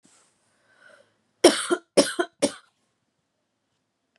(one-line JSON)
{"three_cough_length": "4.2 s", "three_cough_amplitude": 29260, "three_cough_signal_mean_std_ratio": 0.24, "survey_phase": "beta (2021-08-13 to 2022-03-07)", "age": "18-44", "gender": "Female", "wearing_mask": "No", "symptom_cough_any": true, "symptom_runny_or_blocked_nose": true, "symptom_sore_throat": true, "symptom_abdominal_pain": true, "symptom_diarrhoea": true, "symptom_fatigue": true, "smoker_status": "Never smoked", "respiratory_condition_asthma": false, "respiratory_condition_other": false, "recruitment_source": "REACT", "submission_delay": "2 days", "covid_test_result": "Negative", "covid_test_method": "RT-qPCR", "influenza_a_test_result": "Negative", "influenza_b_test_result": "Negative"}